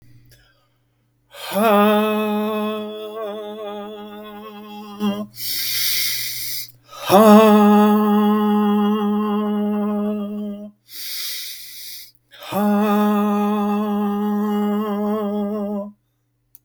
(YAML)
exhalation_length: 16.6 s
exhalation_amplitude: 32768
exhalation_signal_mean_std_ratio: 0.75
survey_phase: beta (2021-08-13 to 2022-03-07)
age: 45-64
gender: Male
wearing_mask: 'No'
symptom_fatigue: true
symptom_onset: 9 days
smoker_status: Ex-smoker
respiratory_condition_asthma: false
respiratory_condition_other: false
recruitment_source: REACT
submission_delay: 5 days
covid_test_result: Negative
covid_test_method: RT-qPCR
influenza_a_test_result: Negative
influenza_b_test_result: Negative